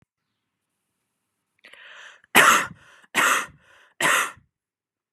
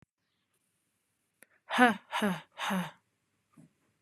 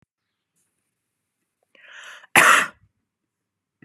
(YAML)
three_cough_length: 5.1 s
three_cough_amplitude: 32358
three_cough_signal_mean_std_ratio: 0.33
exhalation_length: 4.0 s
exhalation_amplitude: 14782
exhalation_signal_mean_std_ratio: 0.3
cough_length: 3.8 s
cough_amplitude: 32768
cough_signal_mean_std_ratio: 0.23
survey_phase: beta (2021-08-13 to 2022-03-07)
age: 18-44
gender: Female
wearing_mask: 'No'
symptom_none: true
smoker_status: Never smoked
respiratory_condition_asthma: false
respiratory_condition_other: false
recruitment_source: REACT
submission_delay: 1 day
covid_test_result: Negative
covid_test_method: RT-qPCR
influenza_a_test_result: Negative
influenza_b_test_result: Negative